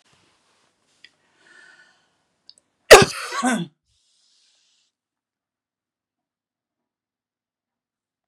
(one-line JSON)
{"cough_length": "8.3 s", "cough_amplitude": 32768, "cough_signal_mean_std_ratio": 0.15, "survey_phase": "beta (2021-08-13 to 2022-03-07)", "age": "45-64", "gender": "Female", "wearing_mask": "No", "symptom_fatigue": true, "symptom_change_to_sense_of_smell_or_taste": true, "symptom_onset": "12 days", "smoker_status": "Never smoked", "respiratory_condition_asthma": false, "respiratory_condition_other": false, "recruitment_source": "REACT", "submission_delay": "2 days", "covid_test_result": "Negative", "covid_test_method": "RT-qPCR", "influenza_a_test_result": "Negative", "influenza_b_test_result": "Negative"}